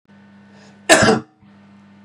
cough_length: 2.0 s
cough_amplitude: 32768
cough_signal_mean_std_ratio: 0.33
survey_phase: beta (2021-08-13 to 2022-03-07)
age: 18-44
gender: Male
wearing_mask: 'No'
symptom_none: true
smoker_status: Ex-smoker
respiratory_condition_asthma: false
respiratory_condition_other: false
recruitment_source: REACT
submission_delay: 2 days
covid_test_result: Negative
covid_test_method: RT-qPCR
influenza_a_test_result: Negative
influenza_b_test_result: Negative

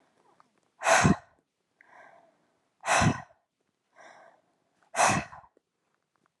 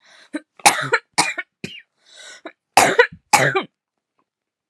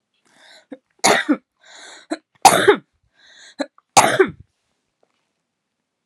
exhalation_length: 6.4 s
exhalation_amplitude: 12334
exhalation_signal_mean_std_ratio: 0.31
cough_length: 4.7 s
cough_amplitude: 32768
cough_signal_mean_std_ratio: 0.34
three_cough_length: 6.1 s
three_cough_amplitude: 32768
three_cough_signal_mean_std_ratio: 0.29
survey_phase: alpha (2021-03-01 to 2021-08-12)
age: 18-44
gender: Female
wearing_mask: 'No'
symptom_none: true
smoker_status: Never smoked
respiratory_condition_asthma: false
respiratory_condition_other: false
recruitment_source: REACT
submission_delay: 1 day
covid_test_result: Negative
covid_test_method: RT-qPCR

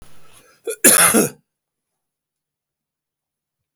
cough_length: 3.8 s
cough_amplitude: 32768
cough_signal_mean_std_ratio: 0.29
survey_phase: beta (2021-08-13 to 2022-03-07)
age: 65+
gender: Male
wearing_mask: 'No'
symptom_new_continuous_cough: true
symptom_fatigue: true
symptom_onset: 3 days
smoker_status: Ex-smoker
respiratory_condition_asthma: false
respiratory_condition_other: false
recruitment_source: Test and Trace
submission_delay: 1 day
covid_test_result: Positive
covid_test_method: RT-qPCR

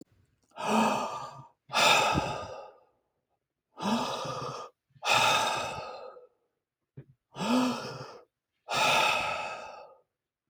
exhalation_length: 10.5 s
exhalation_amplitude: 11150
exhalation_signal_mean_std_ratio: 0.54
survey_phase: alpha (2021-03-01 to 2021-08-12)
age: 45-64
gender: Male
wearing_mask: 'No'
symptom_none: true
smoker_status: Never smoked
respiratory_condition_asthma: false
respiratory_condition_other: false
recruitment_source: REACT
submission_delay: 3 days
covid_test_result: Negative
covid_test_method: RT-qPCR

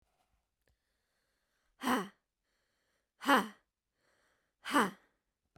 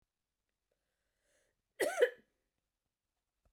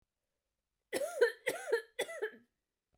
exhalation_length: 5.6 s
exhalation_amplitude: 6115
exhalation_signal_mean_std_ratio: 0.26
cough_length: 3.5 s
cough_amplitude: 5013
cough_signal_mean_std_ratio: 0.2
three_cough_length: 3.0 s
three_cough_amplitude: 4869
three_cough_signal_mean_std_ratio: 0.39
survey_phase: beta (2021-08-13 to 2022-03-07)
age: 18-44
gender: Female
wearing_mask: 'No'
symptom_cough_any: true
smoker_status: Never smoked
respiratory_condition_asthma: true
respiratory_condition_other: false
recruitment_source: REACT
submission_delay: 2 days
covid_test_result: Negative
covid_test_method: RT-qPCR
influenza_a_test_result: Negative
influenza_b_test_result: Negative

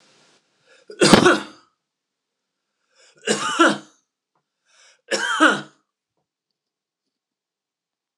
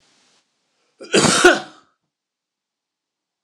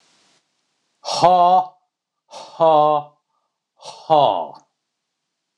three_cough_length: 8.2 s
three_cough_amplitude: 26028
three_cough_signal_mean_std_ratio: 0.29
cough_length: 3.4 s
cough_amplitude: 26028
cough_signal_mean_std_ratio: 0.29
exhalation_length: 5.6 s
exhalation_amplitude: 26027
exhalation_signal_mean_std_ratio: 0.4
survey_phase: beta (2021-08-13 to 2022-03-07)
age: 45-64
gender: Male
wearing_mask: 'No'
symptom_none: true
smoker_status: Never smoked
respiratory_condition_asthma: false
respiratory_condition_other: false
recruitment_source: REACT
submission_delay: 1 day
covid_test_result: Negative
covid_test_method: RT-qPCR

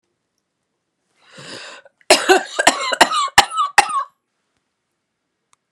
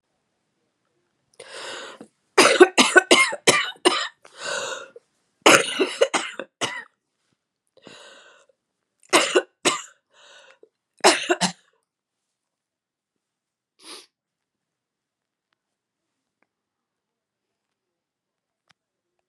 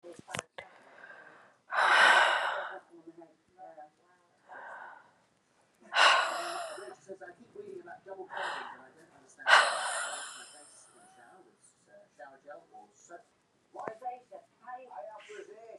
cough_length: 5.7 s
cough_amplitude: 32768
cough_signal_mean_std_ratio: 0.34
three_cough_length: 19.3 s
three_cough_amplitude: 32768
three_cough_signal_mean_std_ratio: 0.27
exhalation_length: 15.8 s
exhalation_amplitude: 15047
exhalation_signal_mean_std_ratio: 0.36
survey_phase: beta (2021-08-13 to 2022-03-07)
age: 45-64
gender: Female
wearing_mask: 'No'
symptom_new_continuous_cough: true
symptom_shortness_of_breath: true
symptom_diarrhoea: true
symptom_fatigue: true
symptom_fever_high_temperature: true
symptom_headache: true
symptom_change_to_sense_of_smell_or_taste: true
symptom_onset: 4 days
smoker_status: Never smoked
respiratory_condition_asthma: false
respiratory_condition_other: false
recruitment_source: Test and Trace
submission_delay: 1 day
covid_test_result: Positive
covid_test_method: RT-qPCR
covid_ct_value: 12.0
covid_ct_gene: ORF1ab gene
covid_ct_mean: 12.2
covid_viral_load: 100000000 copies/ml
covid_viral_load_category: High viral load (>1M copies/ml)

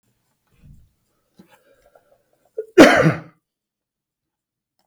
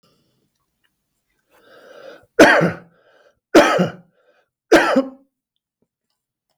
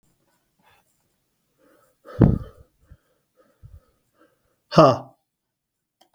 cough_length: 4.9 s
cough_amplitude: 32768
cough_signal_mean_std_ratio: 0.22
three_cough_length: 6.6 s
three_cough_amplitude: 32768
three_cough_signal_mean_std_ratio: 0.3
exhalation_length: 6.1 s
exhalation_amplitude: 32768
exhalation_signal_mean_std_ratio: 0.2
survey_phase: beta (2021-08-13 to 2022-03-07)
age: 45-64
gender: Male
wearing_mask: 'No'
symptom_none: true
smoker_status: Ex-smoker
respiratory_condition_asthma: false
respiratory_condition_other: false
recruitment_source: REACT
submission_delay: 5 days
covid_test_result: Negative
covid_test_method: RT-qPCR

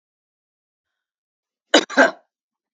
cough_length: 2.7 s
cough_amplitude: 32768
cough_signal_mean_std_ratio: 0.21
survey_phase: beta (2021-08-13 to 2022-03-07)
age: 65+
gender: Female
wearing_mask: 'No'
symptom_none: true
smoker_status: Never smoked
respiratory_condition_asthma: false
respiratory_condition_other: false
recruitment_source: REACT
submission_delay: 1 day
covid_test_result: Negative
covid_test_method: RT-qPCR
influenza_a_test_result: Negative
influenza_b_test_result: Negative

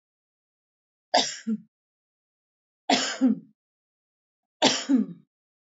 three_cough_length: 5.7 s
three_cough_amplitude: 17057
three_cough_signal_mean_std_ratio: 0.34
survey_phase: alpha (2021-03-01 to 2021-08-12)
age: 45-64
gender: Female
wearing_mask: 'No'
symptom_none: true
smoker_status: Never smoked
respiratory_condition_asthma: false
respiratory_condition_other: false
recruitment_source: REACT
submission_delay: 2 days
covid_test_result: Negative
covid_test_method: RT-qPCR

